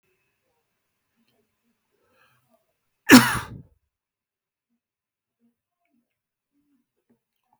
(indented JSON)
{
  "cough_length": "7.6 s",
  "cough_amplitude": 32768,
  "cough_signal_mean_std_ratio": 0.13,
  "survey_phase": "beta (2021-08-13 to 2022-03-07)",
  "age": "65+",
  "gender": "Male",
  "wearing_mask": "No",
  "symptom_none": true,
  "smoker_status": "Never smoked",
  "respiratory_condition_asthma": false,
  "respiratory_condition_other": false,
  "recruitment_source": "REACT",
  "submission_delay": "4 days",
  "covid_test_result": "Negative",
  "covid_test_method": "RT-qPCR"
}